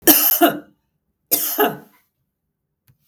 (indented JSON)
{
  "cough_length": "3.1 s",
  "cough_amplitude": 32768,
  "cough_signal_mean_std_ratio": 0.4,
  "survey_phase": "beta (2021-08-13 to 2022-03-07)",
  "age": "45-64",
  "gender": "Female",
  "wearing_mask": "No",
  "symptom_none": true,
  "smoker_status": "Ex-smoker",
  "respiratory_condition_asthma": false,
  "respiratory_condition_other": false,
  "recruitment_source": "REACT",
  "submission_delay": "0 days",
  "covid_test_result": "Negative",
  "covid_test_method": "RT-qPCR",
  "influenza_a_test_result": "Unknown/Void",
  "influenza_b_test_result": "Unknown/Void"
}